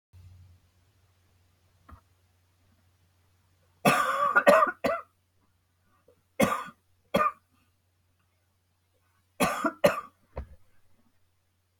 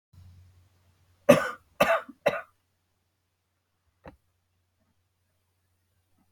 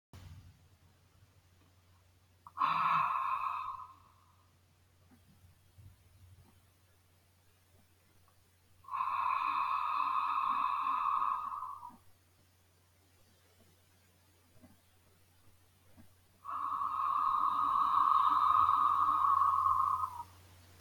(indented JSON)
{
  "three_cough_length": "11.8 s",
  "three_cough_amplitude": 19674,
  "three_cough_signal_mean_std_ratio": 0.3,
  "cough_length": "6.3 s",
  "cough_amplitude": 24089,
  "cough_signal_mean_std_ratio": 0.2,
  "exhalation_length": "20.8 s",
  "exhalation_amplitude": 4954,
  "exhalation_signal_mean_std_ratio": 0.55,
  "survey_phase": "beta (2021-08-13 to 2022-03-07)",
  "age": "65+",
  "gender": "Female",
  "wearing_mask": "No",
  "symptom_cough_any": true,
  "smoker_status": "Never smoked",
  "respiratory_condition_asthma": false,
  "respiratory_condition_other": false,
  "recruitment_source": "REACT",
  "submission_delay": "1 day",
  "covid_test_result": "Negative",
  "covid_test_method": "RT-qPCR",
  "influenza_a_test_result": "Negative",
  "influenza_b_test_result": "Negative"
}